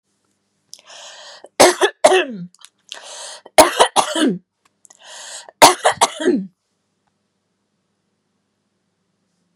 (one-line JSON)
{"three_cough_length": "9.6 s", "three_cough_amplitude": 32768, "three_cough_signal_mean_std_ratio": 0.31, "survey_phase": "beta (2021-08-13 to 2022-03-07)", "age": "45-64", "gender": "Female", "wearing_mask": "No", "symptom_none": true, "smoker_status": "Never smoked", "respiratory_condition_asthma": false, "respiratory_condition_other": false, "recruitment_source": "REACT", "submission_delay": "1 day", "covid_test_result": "Negative", "covid_test_method": "RT-qPCR", "influenza_a_test_result": "Negative", "influenza_b_test_result": "Negative"}